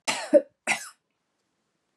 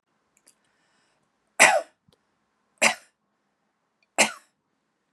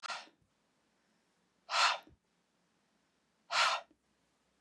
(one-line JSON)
{"cough_length": "2.0 s", "cough_amplitude": 15366, "cough_signal_mean_std_ratio": 0.28, "three_cough_length": "5.1 s", "three_cough_amplitude": 30111, "three_cough_signal_mean_std_ratio": 0.22, "exhalation_length": "4.6 s", "exhalation_amplitude": 4728, "exhalation_signal_mean_std_ratio": 0.3, "survey_phase": "beta (2021-08-13 to 2022-03-07)", "age": "45-64", "gender": "Female", "wearing_mask": "No", "symptom_none": true, "smoker_status": "Ex-smoker", "respiratory_condition_asthma": false, "respiratory_condition_other": false, "recruitment_source": "REACT", "submission_delay": "2 days", "covid_test_result": "Negative", "covid_test_method": "RT-qPCR", "influenza_a_test_result": "Negative", "influenza_b_test_result": "Negative"}